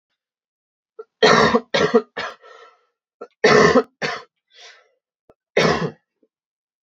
{"three_cough_length": "6.8 s", "three_cough_amplitude": 32767, "three_cough_signal_mean_std_ratio": 0.37, "survey_phase": "beta (2021-08-13 to 2022-03-07)", "age": "18-44", "gender": "Male", "wearing_mask": "No", "symptom_cough_any": true, "symptom_runny_or_blocked_nose": true, "symptom_sore_throat": true, "symptom_fatigue": true, "symptom_headache": true, "smoker_status": "Never smoked", "respiratory_condition_asthma": false, "respiratory_condition_other": false, "recruitment_source": "Test and Trace", "submission_delay": "3 days", "covid_test_result": "Positive", "covid_test_method": "LFT"}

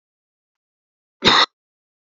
{"cough_length": "2.1 s", "cough_amplitude": 31440, "cough_signal_mean_std_ratio": 0.25, "survey_phase": "beta (2021-08-13 to 2022-03-07)", "age": "18-44", "gender": "Female", "wearing_mask": "No", "symptom_runny_or_blocked_nose": true, "smoker_status": "Ex-smoker", "respiratory_condition_asthma": false, "respiratory_condition_other": false, "recruitment_source": "Test and Trace", "submission_delay": "1 day", "covid_test_result": "Positive", "covid_test_method": "RT-qPCR", "covid_ct_value": 31.0, "covid_ct_gene": "ORF1ab gene", "covid_ct_mean": 31.8, "covid_viral_load": "36 copies/ml", "covid_viral_load_category": "Minimal viral load (< 10K copies/ml)"}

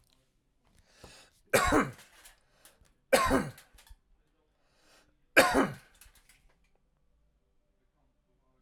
{"cough_length": "8.6 s", "cough_amplitude": 15850, "cough_signal_mean_std_ratio": 0.27, "survey_phase": "alpha (2021-03-01 to 2021-08-12)", "age": "45-64", "gender": "Male", "wearing_mask": "No", "symptom_none": true, "smoker_status": "Ex-smoker", "respiratory_condition_asthma": false, "respiratory_condition_other": false, "recruitment_source": "REACT", "submission_delay": "3 days", "covid_test_result": "Negative", "covid_test_method": "RT-qPCR"}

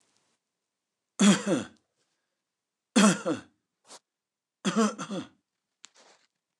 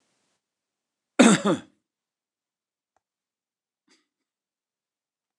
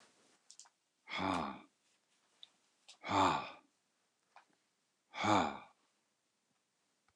{"three_cough_length": "6.6 s", "three_cough_amplitude": 15127, "three_cough_signal_mean_std_ratio": 0.31, "cough_length": "5.4 s", "cough_amplitude": 28269, "cough_signal_mean_std_ratio": 0.18, "exhalation_length": "7.2 s", "exhalation_amplitude": 5653, "exhalation_signal_mean_std_ratio": 0.32, "survey_phase": "beta (2021-08-13 to 2022-03-07)", "age": "65+", "gender": "Male", "wearing_mask": "No", "symptom_none": true, "smoker_status": "Ex-smoker", "respiratory_condition_asthma": false, "respiratory_condition_other": false, "recruitment_source": "REACT", "submission_delay": "1 day", "covid_test_result": "Negative", "covid_test_method": "RT-qPCR"}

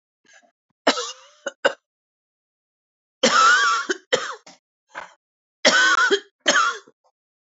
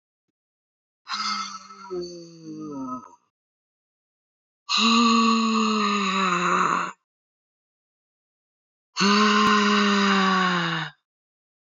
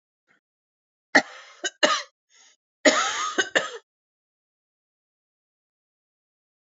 {"three_cough_length": "7.4 s", "three_cough_amplitude": 26766, "three_cough_signal_mean_std_ratio": 0.42, "exhalation_length": "11.8 s", "exhalation_amplitude": 15717, "exhalation_signal_mean_std_ratio": 0.57, "cough_length": "6.7 s", "cough_amplitude": 27079, "cough_signal_mean_std_ratio": 0.27, "survey_phase": "alpha (2021-03-01 to 2021-08-12)", "age": "45-64", "gender": "Female", "wearing_mask": "No", "symptom_cough_any": true, "symptom_fatigue": true, "symptom_fever_high_temperature": true, "symptom_headache": true, "symptom_change_to_sense_of_smell_or_taste": true, "symptom_loss_of_taste": true, "symptom_onset": "4 days", "smoker_status": "Ex-smoker", "respiratory_condition_asthma": false, "respiratory_condition_other": false, "recruitment_source": "Test and Trace", "submission_delay": "2 days", "covid_test_result": "Positive", "covid_test_method": "RT-qPCR", "covid_ct_value": 16.9, "covid_ct_gene": "ORF1ab gene", "covid_ct_mean": 17.3, "covid_viral_load": "2200000 copies/ml", "covid_viral_load_category": "High viral load (>1M copies/ml)"}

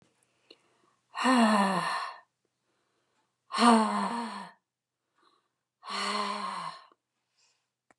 {"exhalation_length": "8.0 s", "exhalation_amplitude": 15054, "exhalation_signal_mean_std_ratio": 0.41, "survey_phase": "beta (2021-08-13 to 2022-03-07)", "age": "45-64", "gender": "Female", "wearing_mask": "No", "symptom_cough_any": true, "symptom_fatigue": true, "smoker_status": "Never smoked", "respiratory_condition_asthma": false, "respiratory_condition_other": false, "recruitment_source": "REACT", "submission_delay": "2 days", "covid_test_result": "Negative", "covid_test_method": "RT-qPCR", "influenza_a_test_result": "Negative", "influenza_b_test_result": "Negative"}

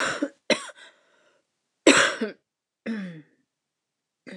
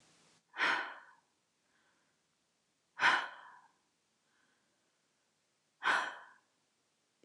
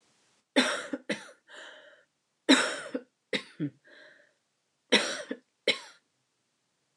{"cough_length": "4.4 s", "cough_amplitude": 26174, "cough_signal_mean_std_ratio": 0.32, "exhalation_length": "7.2 s", "exhalation_amplitude": 5717, "exhalation_signal_mean_std_ratio": 0.28, "three_cough_length": "7.0 s", "three_cough_amplitude": 14781, "three_cough_signal_mean_std_ratio": 0.31, "survey_phase": "beta (2021-08-13 to 2022-03-07)", "age": "45-64", "gender": "Female", "wearing_mask": "No", "symptom_cough_any": true, "symptom_sore_throat": true, "symptom_abdominal_pain": true, "symptom_fever_high_temperature": true, "symptom_onset": "3 days", "smoker_status": "Never smoked", "respiratory_condition_asthma": false, "respiratory_condition_other": false, "recruitment_source": "Test and Trace", "submission_delay": "2 days", "covid_test_result": "Positive", "covid_test_method": "RT-qPCR", "covid_ct_value": 24.2, "covid_ct_gene": "N gene"}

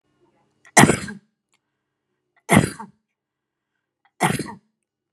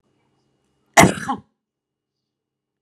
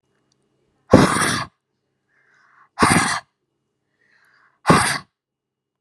{"three_cough_length": "5.1 s", "three_cough_amplitude": 32768, "three_cough_signal_mean_std_ratio": 0.24, "cough_length": "2.8 s", "cough_amplitude": 32768, "cough_signal_mean_std_ratio": 0.21, "exhalation_length": "5.8 s", "exhalation_amplitude": 32768, "exhalation_signal_mean_std_ratio": 0.33, "survey_phase": "beta (2021-08-13 to 2022-03-07)", "age": "18-44", "gender": "Female", "wearing_mask": "No", "symptom_none": true, "smoker_status": "Ex-smoker", "respiratory_condition_asthma": false, "respiratory_condition_other": false, "recruitment_source": "REACT", "submission_delay": "2 days", "covid_test_result": "Negative", "covid_test_method": "RT-qPCR"}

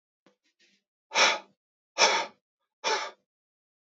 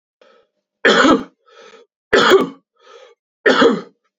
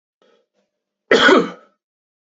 {"exhalation_length": "3.9 s", "exhalation_amplitude": 15126, "exhalation_signal_mean_std_ratio": 0.33, "three_cough_length": "4.2 s", "three_cough_amplitude": 32767, "three_cough_signal_mean_std_ratio": 0.43, "cough_length": "2.4 s", "cough_amplitude": 32767, "cough_signal_mean_std_ratio": 0.31, "survey_phase": "beta (2021-08-13 to 2022-03-07)", "age": "18-44", "gender": "Male", "wearing_mask": "No", "symptom_none": true, "smoker_status": "Ex-smoker", "respiratory_condition_asthma": false, "respiratory_condition_other": false, "recruitment_source": "REACT", "submission_delay": "2 days", "covid_test_result": "Negative", "covid_test_method": "RT-qPCR", "influenza_a_test_result": "Negative", "influenza_b_test_result": "Negative"}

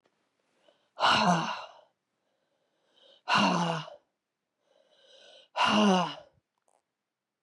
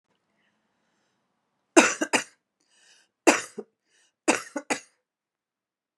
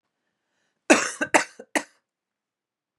{"exhalation_length": "7.4 s", "exhalation_amplitude": 8916, "exhalation_signal_mean_std_ratio": 0.39, "three_cough_length": "6.0 s", "three_cough_amplitude": 31372, "three_cough_signal_mean_std_ratio": 0.22, "cough_length": "3.0 s", "cough_amplitude": 32031, "cough_signal_mean_std_ratio": 0.25, "survey_phase": "beta (2021-08-13 to 2022-03-07)", "age": "45-64", "gender": "Female", "wearing_mask": "No", "symptom_cough_any": true, "symptom_runny_or_blocked_nose": true, "symptom_sore_throat": true, "symptom_fatigue": true, "symptom_other": true, "symptom_onset": "3 days", "smoker_status": "Ex-smoker", "respiratory_condition_asthma": false, "respiratory_condition_other": false, "recruitment_source": "Test and Trace", "submission_delay": "2 days", "covid_test_result": "Positive", "covid_test_method": "RT-qPCR", "covid_ct_value": 23.5, "covid_ct_gene": "N gene", "covid_ct_mean": 23.5, "covid_viral_load": "19000 copies/ml", "covid_viral_load_category": "Low viral load (10K-1M copies/ml)"}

